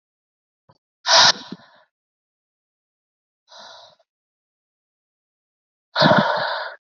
{"exhalation_length": "7.0 s", "exhalation_amplitude": 29944, "exhalation_signal_mean_std_ratio": 0.28, "survey_phase": "beta (2021-08-13 to 2022-03-07)", "age": "18-44", "gender": "Female", "wearing_mask": "No", "symptom_cough_any": true, "symptom_fatigue": true, "symptom_fever_high_temperature": true, "symptom_headache": true, "symptom_change_to_sense_of_smell_or_taste": true, "symptom_onset": "2 days", "smoker_status": "Never smoked", "respiratory_condition_asthma": true, "respiratory_condition_other": false, "recruitment_source": "Test and Trace", "submission_delay": "2 days", "covid_test_result": "Positive", "covid_test_method": "RT-qPCR", "covid_ct_value": 17.2, "covid_ct_gene": "N gene"}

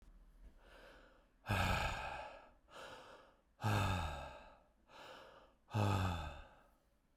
{"exhalation_length": "7.2 s", "exhalation_amplitude": 2305, "exhalation_signal_mean_std_ratio": 0.51, "survey_phase": "beta (2021-08-13 to 2022-03-07)", "age": "45-64", "gender": "Male", "wearing_mask": "No", "symptom_cough_any": true, "symptom_runny_or_blocked_nose": true, "symptom_onset": "6 days", "smoker_status": "Never smoked", "respiratory_condition_asthma": false, "respiratory_condition_other": false, "recruitment_source": "Test and Trace", "submission_delay": "3 days", "covid_test_result": "Positive", "covid_test_method": "RT-qPCR", "covid_ct_value": 10.8, "covid_ct_gene": "ORF1ab gene", "covid_ct_mean": 11.9, "covid_viral_load": "130000000 copies/ml", "covid_viral_load_category": "High viral load (>1M copies/ml)"}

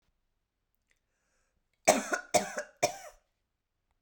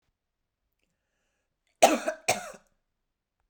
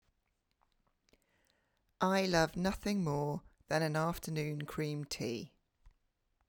{"three_cough_length": "4.0 s", "three_cough_amplitude": 15821, "three_cough_signal_mean_std_ratio": 0.26, "cough_length": "3.5 s", "cough_amplitude": 19505, "cough_signal_mean_std_ratio": 0.22, "exhalation_length": "6.5 s", "exhalation_amplitude": 5281, "exhalation_signal_mean_std_ratio": 0.53, "survey_phase": "beta (2021-08-13 to 2022-03-07)", "age": "45-64", "gender": "Female", "wearing_mask": "No", "symptom_abdominal_pain": true, "symptom_onset": "4 days", "smoker_status": "Never smoked", "respiratory_condition_asthma": false, "respiratory_condition_other": false, "recruitment_source": "REACT", "submission_delay": "2 days", "covid_test_result": "Negative", "covid_test_method": "RT-qPCR"}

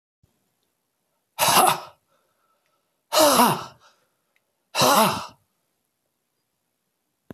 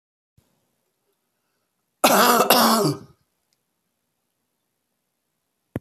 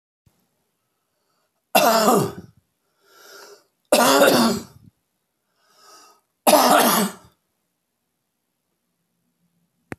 {"exhalation_length": "7.3 s", "exhalation_amplitude": 28900, "exhalation_signal_mean_std_ratio": 0.33, "cough_length": "5.8 s", "cough_amplitude": 28353, "cough_signal_mean_std_ratio": 0.31, "three_cough_length": "10.0 s", "three_cough_amplitude": 28645, "three_cough_signal_mean_std_ratio": 0.35, "survey_phase": "beta (2021-08-13 to 2022-03-07)", "age": "65+", "gender": "Male", "wearing_mask": "No", "symptom_cough_any": true, "symptom_runny_or_blocked_nose": true, "symptom_fatigue": true, "symptom_headache": true, "symptom_onset": "5 days", "smoker_status": "Never smoked", "respiratory_condition_asthma": false, "respiratory_condition_other": false, "recruitment_source": "Test and Trace", "submission_delay": "2 days", "covid_test_result": "Positive", "covid_test_method": "RT-qPCR", "covid_ct_value": 17.6, "covid_ct_gene": "ORF1ab gene", "covid_ct_mean": 17.9, "covid_viral_load": "1300000 copies/ml", "covid_viral_load_category": "High viral load (>1M copies/ml)"}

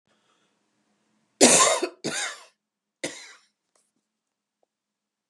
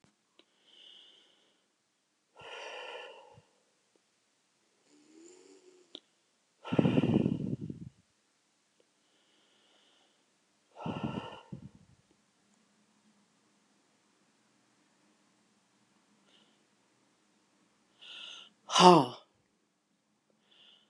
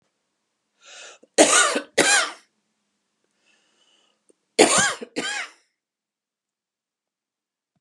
{"three_cough_length": "5.3 s", "three_cough_amplitude": 29682, "three_cough_signal_mean_std_ratio": 0.26, "exhalation_length": "20.9 s", "exhalation_amplitude": 19831, "exhalation_signal_mean_std_ratio": 0.19, "cough_length": "7.8 s", "cough_amplitude": 32072, "cough_signal_mean_std_ratio": 0.31, "survey_phase": "beta (2021-08-13 to 2022-03-07)", "age": "65+", "gender": "Female", "wearing_mask": "No", "symptom_none": true, "smoker_status": "Ex-smoker", "respiratory_condition_asthma": false, "respiratory_condition_other": false, "recruitment_source": "REACT", "submission_delay": "4 days", "covid_test_result": "Negative", "covid_test_method": "RT-qPCR", "influenza_a_test_result": "Negative", "influenza_b_test_result": "Negative"}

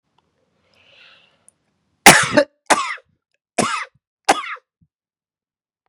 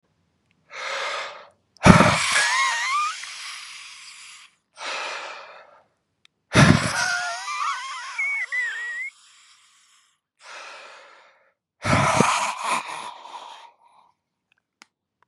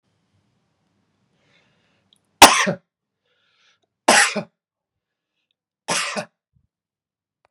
{"cough_length": "5.9 s", "cough_amplitude": 32768, "cough_signal_mean_std_ratio": 0.26, "exhalation_length": "15.3 s", "exhalation_amplitude": 32768, "exhalation_signal_mean_std_ratio": 0.44, "three_cough_length": "7.5 s", "three_cough_amplitude": 32768, "three_cough_signal_mean_std_ratio": 0.21, "survey_phase": "beta (2021-08-13 to 2022-03-07)", "age": "45-64", "gender": "Male", "wearing_mask": "No", "symptom_none": true, "smoker_status": "Ex-smoker", "respiratory_condition_asthma": false, "respiratory_condition_other": false, "recruitment_source": "REACT", "submission_delay": "2 days", "covid_test_result": "Negative", "covid_test_method": "RT-qPCR", "influenza_a_test_result": "Negative", "influenza_b_test_result": "Negative"}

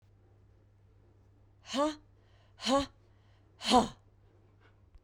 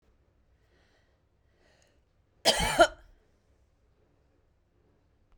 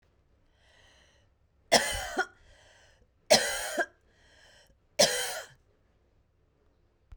{"exhalation_length": "5.0 s", "exhalation_amplitude": 8416, "exhalation_signal_mean_std_ratio": 0.3, "cough_length": "5.4 s", "cough_amplitude": 15567, "cough_signal_mean_std_ratio": 0.2, "three_cough_length": "7.2 s", "three_cough_amplitude": 14435, "three_cough_signal_mean_std_ratio": 0.3, "survey_phase": "beta (2021-08-13 to 2022-03-07)", "age": "45-64", "gender": "Female", "wearing_mask": "No", "symptom_none": true, "smoker_status": "Never smoked", "respiratory_condition_asthma": false, "respiratory_condition_other": false, "recruitment_source": "REACT", "submission_delay": "2 days", "covid_test_result": "Negative", "covid_test_method": "RT-qPCR"}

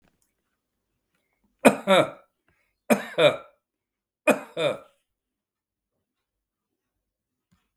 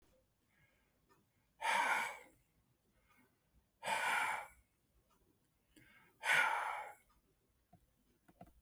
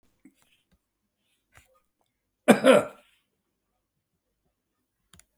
{"three_cough_length": "7.8 s", "three_cough_amplitude": 32766, "three_cough_signal_mean_std_ratio": 0.25, "exhalation_length": "8.6 s", "exhalation_amplitude": 3477, "exhalation_signal_mean_std_ratio": 0.37, "cough_length": "5.4 s", "cough_amplitude": 26327, "cough_signal_mean_std_ratio": 0.18, "survey_phase": "beta (2021-08-13 to 2022-03-07)", "age": "65+", "gender": "Male", "wearing_mask": "No", "symptom_none": true, "smoker_status": "Ex-smoker", "respiratory_condition_asthma": false, "respiratory_condition_other": false, "recruitment_source": "REACT", "submission_delay": "2 days", "covid_test_result": "Negative", "covid_test_method": "RT-qPCR"}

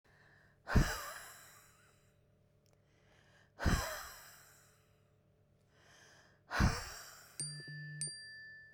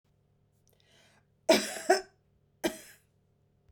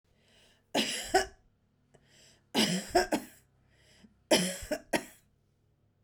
{"exhalation_length": "8.7 s", "exhalation_amplitude": 4707, "exhalation_signal_mean_std_ratio": 0.35, "cough_length": "3.7 s", "cough_amplitude": 11187, "cough_signal_mean_std_ratio": 0.25, "three_cough_length": "6.0 s", "three_cough_amplitude": 10375, "three_cough_signal_mean_std_ratio": 0.37, "survey_phase": "beta (2021-08-13 to 2022-03-07)", "age": "45-64", "gender": "Female", "wearing_mask": "No", "symptom_none": true, "smoker_status": "Never smoked", "respiratory_condition_asthma": true, "respiratory_condition_other": false, "recruitment_source": "REACT", "submission_delay": "5 days", "covid_test_result": "Negative", "covid_test_method": "RT-qPCR", "influenza_a_test_result": "Negative", "influenza_b_test_result": "Negative"}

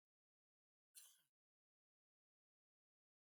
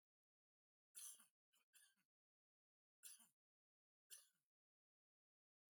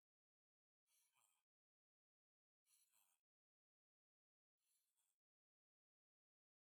{"cough_length": "3.3 s", "cough_amplitude": 147, "cough_signal_mean_std_ratio": 0.19, "three_cough_length": "5.8 s", "three_cough_amplitude": 188, "three_cough_signal_mean_std_ratio": 0.26, "exhalation_length": "6.8 s", "exhalation_amplitude": 16, "exhalation_signal_mean_std_ratio": 0.3, "survey_phase": "beta (2021-08-13 to 2022-03-07)", "age": "65+", "gender": "Male", "wearing_mask": "No", "symptom_change_to_sense_of_smell_or_taste": true, "symptom_onset": "6 days", "smoker_status": "Never smoked", "respiratory_condition_asthma": false, "respiratory_condition_other": false, "recruitment_source": "Test and Trace", "submission_delay": "2 days", "covid_test_result": "Negative", "covid_test_method": "RT-qPCR"}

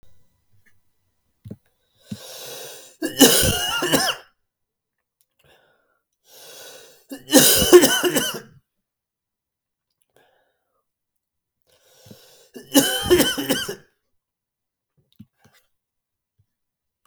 {"three_cough_length": "17.1 s", "three_cough_amplitude": 32768, "three_cough_signal_mean_std_ratio": 0.3, "survey_phase": "beta (2021-08-13 to 2022-03-07)", "age": "18-44", "gender": "Male", "wearing_mask": "No", "symptom_cough_any": true, "symptom_new_continuous_cough": true, "symptom_runny_or_blocked_nose": true, "symptom_fever_high_temperature": true, "smoker_status": "Never smoked", "respiratory_condition_asthma": false, "respiratory_condition_other": false, "recruitment_source": "Test and Trace", "submission_delay": "1 day", "covid_test_result": "Positive", "covid_test_method": "LAMP"}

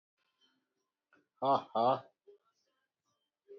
{"exhalation_length": "3.6 s", "exhalation_amplitude": 4478, "exhalation_signal_mean_std_ratio": 0.28, "survey_phase": "beta (2021-08-13 to 2022-03-07)", "age": "18-44", "gender": "Male", "wearing_mask": "No", "symptom_none": true, "smoker_status": "Ex-smoker", "respiratory_condition_asthma": false, "respiratory_condition_other": false, "recruitment_source": "REACT", "submission_delay": "3 days", "covid_test_result": "Negative", "covid_test_method": "RT-qPCR"}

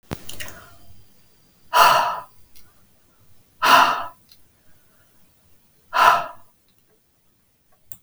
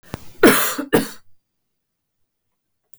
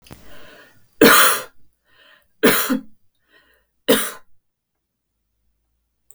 {"exhalation_length": "8.0 s", "exhalation_amplitude": 32766, "exhalation_signal_mean_std_ratio": 0.34, "cough_length": "3.0 s", "cough_amplitude": 32766, "cough_signal_mean_std_ratio": 0.33, "three_cough_length": "6.1 s", "three_cough_amplitude": 32768, "three_cough_signal_mean_std_ratio": 0.32, "survey_phase": "beta (2021-08-13 to 2022-03-07)", "age": "45-64", "gender": "Female", "wearing_mask": "No", "symptom_none": true, "symptom_onset": "4 days", "smoker_status": "Never smoked", "respiratory_condition_asthma": false, "respiratory_condition_other": false, "recruitment_source": "REACT", "submission_delay": "2 days", "covid_test_result": "Negative", "covid_test_method": "RT-qPCR", "influenza_a_test_result": "Negative", "influenza_b_test_result": "Negative"}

